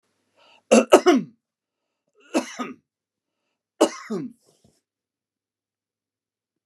{"three_cough_length": "6.7 s", "three_cough_amplitude": 32767, "three_cough_signal_mean_std_ratio": 0.24, "survey_phase": "beta (2021-08-13 to 2022-03-07)", "age": "65+", "gender": "Male", "wearing_mask": "No", "symptom_none": true, "smoker_status": "Never smoked", "respiratory_condition_asthma": false, "respiratory_condition_other": false, "recruitment_source": "REACT", "submission_delay": "5 days", "covid_test_result": "Negative", "covid_test_method": "RT-qPCR", "influenza_a_test_result": "Negative", "influenza_b_test_result": "Negative"}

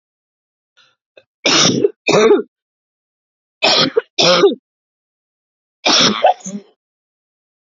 {"three_cough_length": "7.7 s", "three_cough_amplitude": 32767, "three_cough_signal_mean_std_ratio": 0.42, "survey_phase": "beta (2021-08-13 to 2022-03-07)", "age": "18-44", "gender": "Female", "wearing_mask": "No", "symptom_new_continuous_cough": true, "symptom_runny_or_blocked_nose": true, "symptom_shortness_of_breath": true, "symptom_diarrhoea": true, "symptom_fatigue": true, "symptom_fever_high_temperature": true, "symptom_headache": true, "symptom_change_to_sense_of_smell_or_taste": true, "symptom_loss_of_taste": true, "symptom_onset": "3 days", "smoker_status": "Ex-smoker", "respiratory_condition_asthma": false, "respiratory_condition_other": false, "recruitment_source": "Test and Trace", "submission_delay": "2 days", "covid_test_result": "Positive", "covid_test_method": "RT-qPCR", "covid_ct_value": 21.1, "covid_ct_gene": "ORF1ab gene"}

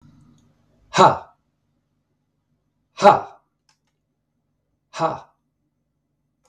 {"exhalation_length": "6.5 s", "exhalation_amplitude": 32768, "exhalation_signal_mean_std_ratio": 0.21, "survey_phase": "beta (2021-08-13 to 2022-03-07)", "age": "45-64", "gender": "Male", "wearing_mask": "No", "symptom_none": true, "symptom_onset": "11 days", "smoker_status": "Never smoked", "respiratory_condition_asthma": true, "respiratory_condition_other": false, "recruitment_source": "REACT", "submission_delay": "1 day", "covid_test_result": "Negative", "covid_test_method": "RT-qPCR"}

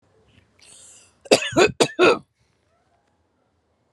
{"cough_length": "3.9 s", "cough_amplitude": 32221, "cough_signal_mean_std_ratio": 0.3, "survey_phase": "alpha (2021-03-01 to 2021-08-12)", "age": "18-44", "gender": "Female", "wearing_mask": "No", "symptom_none": true, "smoker_status": "Never smoked", "respiratory_condition_asthma": true, "respiratory_condition_other": false, "recruitment_source": "REACT", "submission_delay": "3 days", "covid_test_result": "Negative", "covid_test_method": "RT-qPCR"}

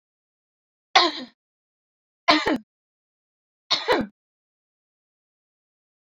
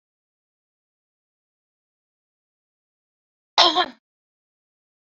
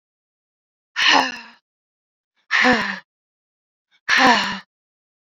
{"three_cough_length": "6.1 s", "three_cough_amplitude": 27723, "three_cough_signal_mean_std_ratio": 0.26, "cough_length": "5.0 s", "cough_amplitude": 27098, "cough_signal_mean_std_ratio": 0.17, "exhalation_length": "5.2 s", "exhalation_amplitude": 26871, "exhalation_signal_mean_std_ratio": 0.39, "survey_phase": "beta (2021-08-13 to 2022-03-07)", "age": "45-64", "gender": "Female", "wearing_mask": "No", "symptom_cough_any": true, "smoker_status": "Current smoker (1 to 10 cigarettes per day)", "respiratory_condition_asthma": false, "respiratory_condition_other": true, "recruitment_source": "REACT", "submission_delay": "1 day", "covid_test_result": "Negative", "covid_test_method": "RT-qPCR", "influenza_a_test_result": "Negative", "influenza_b_test_result": "Negative"}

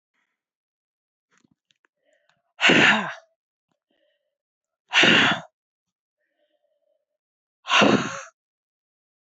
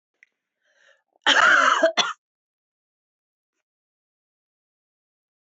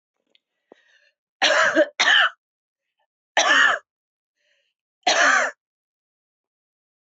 {"exhalation_length": "9.4 s", "exhalation_amplitude": 20614, "exhalation_signal_mean_std_ratio": 0.3, "cough_length": "5.5 s", "cough_amplitude": 19144, "cough_signal_mean_std_ratio": 0.3, "three_cough_length": "7.1 s", "three_cough_amplitude": 22148, "three_cough_signal_mean_std_ratio": 0.39, "survey_phase": "alpha (2021-03-01 to 2021-08-12)", "age": "45-64", "gender": "Female", "wearing_mask": "No", "symptom_fatigue": true, "symptom_onset": "12 days", "smoker_status": "Never smoked", "respiratory_condition_asthma": false, "respiratory_condition_other": false, "recruitment_source": "REACT", "submission_delay": "1 day", "covid_test_result": "Negative", "covid_test_method": "RT-qPCR"}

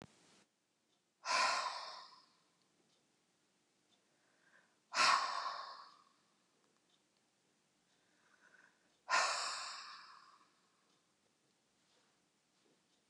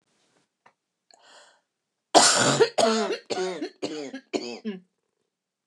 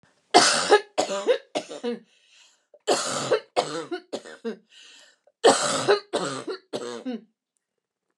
{"exhalation_length": "13.1 s", "exhalation_amplitude": 3974, "exhalation_signal_mean_std_ratio": 0.31, "cough_length": "5.7 s", "cough_amplitude": 27595, "cough_signal_mean_std_ratio": 0.4, "three_cough_length": "8.2 s", "three_cough_amplitude": 28883, "three_cough_signal_mean_std_ratio": 0.44, "survey_phase": "beta (2021-08-13 to 2022-03-07)", "age": "45-64", "gender": "Female", "wearing_mask": "No", "symptom_none": true, "symptom_onset": "2 days", "smoker_status": "Never smoked", "respiratory_condition_asthma": true, "respiratory_condition_other": false, "recruitment_source": "REACT", "submission_delay": "1 day", "covid_test_result": "Negative", "covid_test_method": "RT-qPCR", "influenza_a_test_result": "Negative", "influenza_b_test_result": "Negative"}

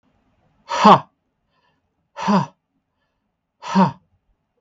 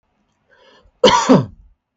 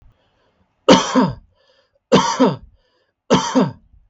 {"exhalation_length": "4.6 s", "exhalation_amplitude": 32768, "exhalation_signal_mean_std_ratio": 0.28, "cough_length": "2.0 s", "cough_amplitude": 32768, "cough_signal_mean_std_ratio": 0.36, "three_cough_length": "4.1 s", "three_cough_amplitude": 32768, "three_cough_signal_mean_std_ratio": 0.41, "survey_phase": "beta (2021-08-13 to 2022-03-07)", "age": "18-44", "gender": "Male", "wearing_mask": "No", "symptom_none": true, "smoker_status": "Never smoked", "respiratory_condition_asthma": false, "respiratory_condition_other": false, "recruitment_source": "REACT", "submission_delay": "2 days", "covid_test_result": "Negative", "covid_test_method": "RT-qPCR", "influenza_a_test_result": "Unknown/Void", "influenza_b_test_result": "Unknown/Void"}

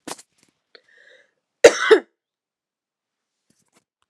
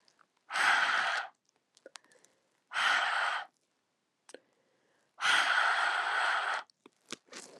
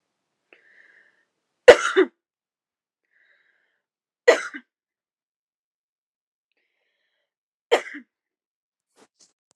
{"cough_length": "4.1 s", "cough_amplitude": 32768, "cough_signal_mean_std_ratio": 0.18, "exhalation_length": "7.6 s", "exhalation_amplitude": 6266, "exhalation_signal_mean_std_ratio": 0.54, "three_cough_length": "9.6 s", "three_cough_amplitude": 32768, "three_cough_signal_mean_std_ratio": 0.15, "survey_phase": "alpha (2021-03-01 to 2021-08-12)", "age": "18-44", "gender": "Female", "wearing_mask": "No", "symptom_shortness_of_breath": true, "symptom_fatigue": true, "symptom_headache": true, "symptom_change_to_sense_of_smell_or_taste": true, "symptom_onset": "2 days", "smoker_status": "Never smoked", "respiratory_condition_asthma": false, "respiratory_condition_other": false, "recruitment_source": "Test and Trace", "submission_delay": "1 day", "covid_test_result": "Positive", "covid_test_method": "RT-qPCR", "covid_ct_value": 23.7, "covid_ct_gene": "ORF1ab gene", "covid_ct_mean": 24.3, "covid_viral_load": "11000 copies/ml", "covid_viral_load_category": "Low viral load (10K-1M copies/ml)"}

